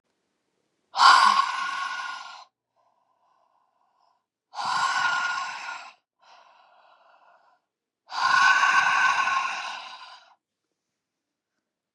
exhalation_length: 11.9 s
exhalation_amplitude: 25936
exhalation_signal_mean_std_ratio: 0.43
survey_phase: beta (2021-08-13 to 2022-03-07)
age: 45-64
gender: Female
wearing_mask: 'No'
symptom_cough_any: true
symptom_runny_or_blocked_nose: true
symptom_sore_throat: true
symptom_fatigue: true
symptom_headache: true
smoker_status: Ex-smoker
respiratory_condition_asthma: false
respiratory_condition_other: false
recruitment_source: Test and Trace
submission_delay: 1 day
covid_test_result: Positive
covid_test_method: LFT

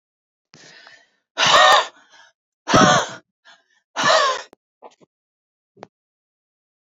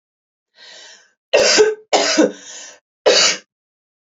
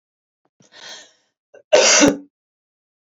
exhalation_length: 6.8 s
exhalation_amplitude: 28658
exhalation_signal_mean_std_ratio: 0.35
three_cough_length: 4.0 s
three_cough_amplitude: 29132
three_cough_signal_mean_std_ratio: 0.45
cough_length: 3.1 s
cough_amplitude: 29202
cough_signal_mean_std_ratio: 0.32
survey_phase: beta (2021-08-13 to 2022-03-07)
age: 45-64
gender: Female
wearing_mask: 'No'
symptom_cough_any: true
symptom_shortness_of_breath: true
symptom_fatigue: true
symptom_onset: 12 days
smoker_status: Current smoker (11 or more cigarettes per day)
respiratory_condition_asthma: false
respiratory_condition_other: false
recruitment_source: REACT
submission_delay: 6 days
covid_test_result: Negative
covid_test_method: RT-qPCR
influenza_a_test_result: Negative
influenza_b_test_result: Negative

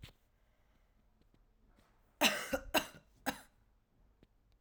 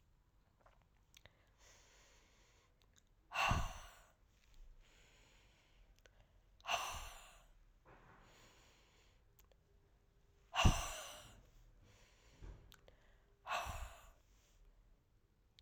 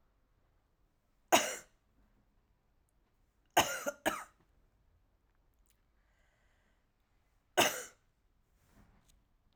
three_cough_length: 4.6 s
three_cough_amplitude: 5454
three_cough_signal_mean_std_ratio: 0.27
exhalation_length: 15.6 s
exhalation_amplitude: 4902
exhalation_signal_mean_std_ratio: 0.28
cough_length: 9.6 s
cough_amplitude: 8474
cough_signal_mean_std_ratio: 0.22
survey_phase: alpha (2021-03-01 to 2021-08-12)
age: 18-44
gender: Female
wearing_mask: 'Yes'
symptom_cough_any: true
symptom_diarrhoea: true
symptom_fever_high_temperature: true
symptom_headache: true
symptom_change_to_sense_of_smell_or_taste: true
symptom_onset: 2 days
smoker_status: Ex-smoker
respiratory_condition_asthma: false
respiratory_condition_other: false
recruitment_source: Test and Trace
submission_delay: 1 day
covid_test_result: Positive
covid_test_method: RT-qPCR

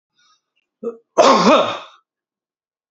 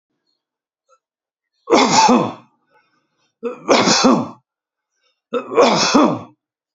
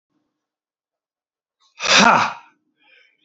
cough_length: 2.9 s
cough_amplitude: 28433
cough_signal_mean_std_ratio: 0.37
three_cough_length: 6.7 s
three_cough_amplitude: 28639
three_cough_signal_mean_std_ratio: 0.45
exhalation_length: 3.2 s
exhalation_amplitude: 31762
exhalation_signal_mean_std_ratio: 0.29
survey_phase: beta (2021-08-13 to 2022-03-07)
age: 65+
gender: Male
wearing_mask: 'No'
symptom_none: true
smoker_status: Never smoked
respiratory_condition_asthma: false
respiratory_condition_other: true
recruitment_source: REACT
submission_delay: 2 days
covid_test_result: Negative
covid_test_method: RT-qPCR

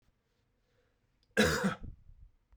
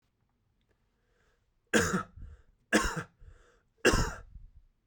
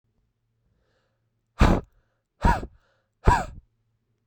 cough_length: 2.6 s
cough_amplitude: 6410
cough_signal_mean_std_ratio: 0.33
three_cough_length: 4.9 s
three_cough_amplitude: 10738
three_cough_signal_mean_std_ratio: 0.34
exhalation_length: 4.3 s
exhalation_amplitude: 24024
exhalation_signal_mean_std_ratio: 0.27
survey_phase: beta (2021-08-13 to 2022-03-07)
age: 18-44
gender: Male
wearing_mask: 'No'
symptom_runny_or_blocked_nose: true
smoker_status: Never smoked
respiratory_condition_asthma: false
respiratory_condition_other: false
recruitment_source: Test and Trace
submission_delay: 2 days
covid_test_result: Positive
covid_test_method: RT-qPCR
covid_ct_value: 20.9
covid_ct_gene: ORF1ab gene
covid_ct_mean: 21.3
covid_viral_load: 100000 copies/ml
covid_viral_load_category: Low viral load (10K-1M copies/ml)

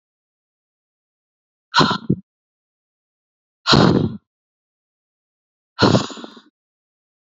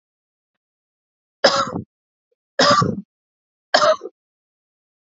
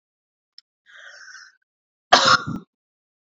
exhalation_length: 7.3 s
exhalation_amplitude: 29104
exhalation_signal_mean_std_ratio: 0.28
three_cough_length: 5.1 s
three_cough_amplitude: 28634
three_cough_signal_mean_std_ratio: 0.33
cough_length: 3.3 s
cough_amplitude: 28806
cough_signal_mean_std_ratio: 0.25
survey_phase: beta (2021-08-13 to 2022-03-07)
age: 18-44
gender: Female
wearing_mask: 'No'
symptom_cough_any: true
symptom_new_continuous_cough: true
symptom_runny_or_blocked_nose: true
symptom_sore_throat: true
symptom_fatigue: true
symptom_other: true
smoker_status: Never smoked
respiratory_condition_asthma: false
respiratory_condition_other: false
recruitment_source: Test and Trace
submission_delay: 1 day
covid_test_result: Positive
covid_test_method: LFT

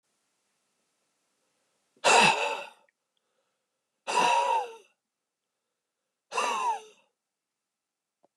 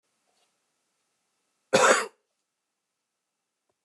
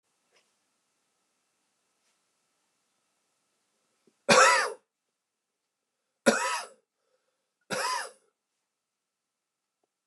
exhalation_length: 8.4 s
exhalation_amplitude: 14326
exhalation_signal_mean_std_ratio: 0.34
cough_length: 3.8 s
cough_amplitude: 16976
cough_signal_mean_std_ratio: 0.22
three_cough_length: 10.1 s
three_cough_amplitude: 18821
three_cough_signal_mean_std_ratio: 0.23
survey_phase: beta (2021-08-13 to 2022-03-07)
age: 45-64
gender: Male
wearing_mask: 'No'
symptom_none: true
smoker_status: Ex-smoker
respiratory_condition_asthma: false
respiratory_condition_other: true
recruitment_source: REACT
submission_delay: 2 days
covid_test_result: Negative
covid_test_method: RT-qPCR
influenza_a_test_result: Negative
influenza_b_test_result: Negative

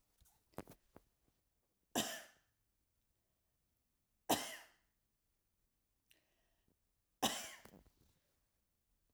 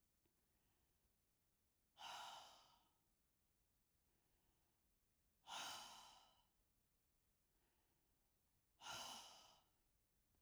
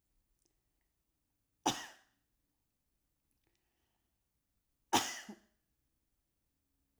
three_cough_length: 9.1 s
three_cough_amplitude: 3750
three_cough_signal_mean_std_ratio: 0.22
exhalation_length: 10.4 s
exhalation_amplitude: 264
exhalation_signal_mean_std_ratio: 0.41
cough_length: 7.0 s
cough_amplitude: 5446
cough_signal_mean_std_ratio: 0.18
survey_phase: alpha (2021-03-01 to 2021-08-12)
age: 65+
gender: Female
wearing_mask: 'No'
symptom_none: true
smoker_status: Never smoked
respiratory_condition_asthma: false
respiratory_condition_other: false
recruitment_source: REACT
submission_delay: 3 days
covid_test_result: Negative
covid_test_method: RT-qPCR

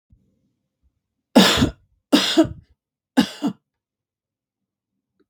three_cough_length: 5.3 s
three_cough_amplitude: 32767
three_cough_signal_mean_std_ratio: 0.3
survey_phase: beta (2021-08-13 to 2022-03-07)
age: 45-64
gender: Female
wearing_mask: 'No'
symptom_none: true
smoker_status: Ex-smoker
respiratory_condition_asthma: false
respiratory_condition_other: false
recruitment_source: REACT
submission_delay: 6 days
covid_test_result: Negative
covid_test_method: RT-qPCR
influenza_a_test_result: Negative
influenza_b_test_result: Negative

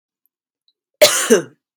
cough_length: 1.8 s
cough_amplitude: 32768
cough_signal_mean_std_ratio: 0.34
survey_phase: beta (2021-08-13 to 2022-03-07)
age: 18-44
gender: Female
wearing_mask: 'No'
symptom_none: true
smoker_status: Never smoked
respiratory_condition_asthma: false
respiratory_condition_other: false
recruitment_source: REACT
submission_delay: 3 days
covid_test_result: Negative
covid_test_method: RT-qPCR
influenza_a_test_result: Negative
influenza_b_test_result: Negative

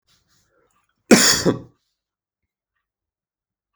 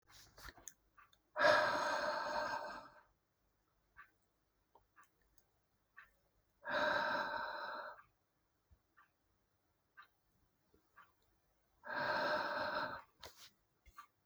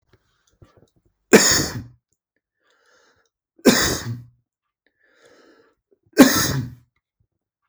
cough_length: 3.8 s
cough_amplitude: 32768
cough_signal_mean_std_ratio: 0.24
exhalation_length: 14.3 s
exhalation_amplitude: 4611
exhalation_signal_mean_std_ratio: 0.41
three_cough_length: 7.7 s
three_cough_amplitude: 32768
three_cough_signal_mean_std_ratio: 0.28
survey_phase: beta (2021-08-13 to 2022-03-07)
age: 18-44
gender: Male
wearing_mask: 'No'
symptom_none: true
symptom_onset: 12 days
smoker_status: Never smoked
respiratory_condition_asthma: false
respiratory_condition_other: false
recruitment_source: REACT
submission_delay: 1 day
covid_test_result: Negative
covid_test_method: RT-qPCR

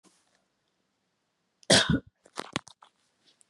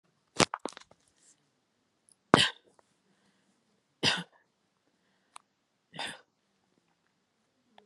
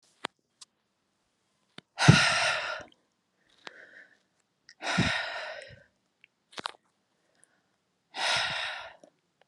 cough_length: 3.5 s
cough_amplitude: 18356
cough_signal_mean_std_ratio: 0.23
three_cough_length: 7.9 s
three_cough_amplitude: 30458
three_cough_signal_mean_std_ratio: 0.16
exhalation_length: 9.5 s
exhalation_amplitude: 24393
exhalation_signal_mean_std_ratio: 0.32
survey_phase: beta (2021-08-13 to 2022-03-07)
age: 18-44
gender: Female
wearing_mask: 'No'
symptom_none: true
symptom_onset: 6 days
smoker_status: Ex-smoker
respiratory_condition_asthma: false
respiratory_condition_other: false
recruitment_source: REACT
submission_delay: 0 days
covid_test_result: Negative
covid_test_method: RT-qPCR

